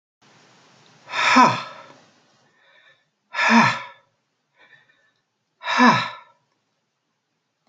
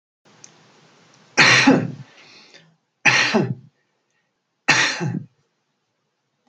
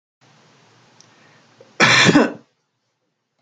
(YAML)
exhalation_length: 7.7 s
exhalation_amplitude: 30163
exhalation_signal_mean_std_ratio: 0.32
three_cough_length: 6.5 s
three_cough_amplitude: 30853
three_cough_signal_mean_std_ratio: 0.37
cough_length: 3.4 s
cough_amplitude: 30110
cough_signal_mean_std_ratio: 0.32
survey_phase: beta (2021-08-13 to 2022-03-07)
age: 65+
gender: Male
wearing_mask: 'No'
symptom_none: true
smoker_status: Never smoked
respiratory_condition_asthma: false
respiratory_condition_other: false
recruitment_source: REACT
submission_delay: 2 days
covid_test_result: Negative
covid_test_method: RT-qPCR